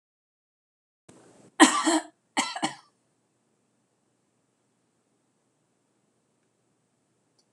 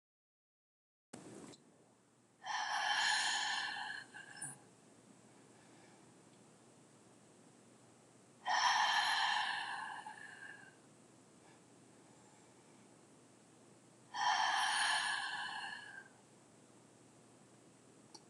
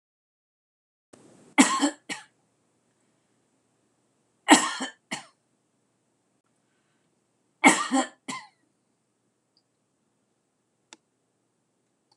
{"cough_length": "7.5 s", "cough_amplitude": 25279, "cough_signal_mean_std_ratio": 0.2, "exhalation_length": "18.3 s", "exhalation_amplitude": 3030, "exhalation_signal_mean_std_ratio": 0.48, "three_cough_length": "12.2 s", "three_cough_amplitude": 26028, "three_cough_signal_mean_std_ratio": 0.21, "survey_phase": "alpha (2021-03-01 to 2021-08-12)", "age": "65+", "gender": "Female", "wearing_mask": "No", "symptom_none": true, "smoker_status": "Never smoked", "respiratory_condition_asthma": false, "respiratory_condition_other": false, "recruitment_source": "REACT", "submission_delay": "2 days", "covid_test_result": "Negative", "covid_test_method": "RT-qPCR"}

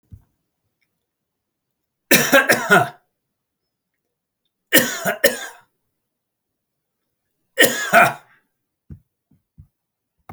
{"three_cough_length": "10.3 s", "three_cough_amplitude": 32768, "three_cough_signal_mean_std_ratio": 0.29, "survey_phase": "beta (2021-08-13 to 2022-03-07)", "age": "65+", "gender": "Male", "wearing_mask": "No", "symptom_none": true, "smoker_status": "Never smoked", "respiratory_condition_asthma": false, "respiratory_condition_other": false, "recruitment_source": "REACT", "submission_delay": "0 days", "covid_test_result": "Negative", "covid_test_method": "RT-qPCR"}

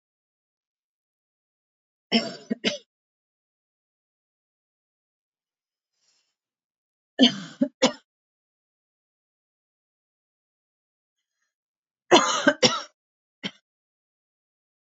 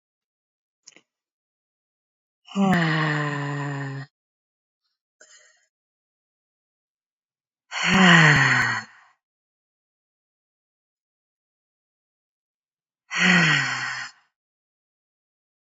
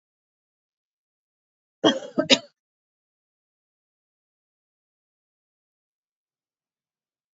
{"three_cough_length": "14.9 s", "three_cough_amplitude": 24107, "three_cough_signal_mean_std_ratio": 0.2, "exhalation_length": "15.6 s", "exhalation_amplitude": 24013, "exhalation_signal_mean_std_ratio": 0.35, "cough_length": "7.3 s", "cough_amplitude": 25859, "cough_signal_mean_std_ratio": 0.14, "survey_phase": "beta (2021-08-13 to 2022-03-07)", "age": "18-44", "gender": "Female", "wearing_mask": "No", "symptom_cough_any": true, "symptom_diarrhoea": true, "symptom_fatigue": true, "symptom_headache": true, "smoker_status": "Never smoked", "respiratory_condition_asthma": false, "respiratory_condition_other": false, "recruitment_source": "Test and Trace", "submission_delay": "2 days", "covid_test_result": "Positive", "covid_test_method": "LFT"}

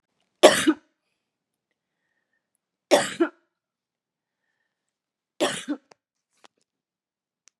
{"three_cough_length": "7.6 s", "three_cough_amplitude": 32767, "three_cough_signal_mean_std_ratio": 0.21, "survey_phase": "beta (2021-08-13 to 2022-03-07)", "age": "45-64", "gender": "Female", "wearing_mask": "No", "symptom_none": true, "smoker_status": "Ex-smoker", "respiratory_condition_asthma": false, "respiratory_condition_other": false, "recruitment_source": "REACT", "submission_delay": "3 days", "covid_test_result": "Negative", "covid_test_method": "RT-qPCR", "influenza_a_test_result": "Negative", "influenza_b_test_result": "Negative"}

